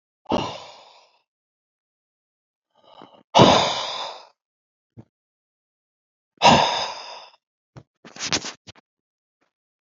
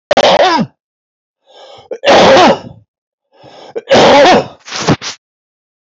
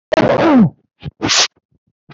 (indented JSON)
{
  "exhalation_length": "9.8 s",
  "exhalation_amplitude": 30797,
  "exhalation_signal_mean_std_ratio": 0.28,
  "three_cough_length": "5.8 s",
  "three_cough_amplitude": 32768,
  "three_cough_signal_mean_std_ratio": 0.56,
  "cough_length": "2.1 s",
  "cough_amplitude": 32768,
  "cough_signal_mean_std_ratio": 0.57,
  "survey_phase": "alpha (2021-03-01 to 2021-08-12)",
  "age": "65+",
  "gender": "Male",
  "wearing_mask": "No",
  "symptom_none": true,
  "smoker_status": "Never smoked",
  "respiratory_condition_asthma": false,
  "respiratory_condition_other": false,
  "recruitment_source": "REACT",
  "submission_delay": "1 day",
  "covid_test_result": "Negative",
  "covid_test_method": "RT-qPCR"
}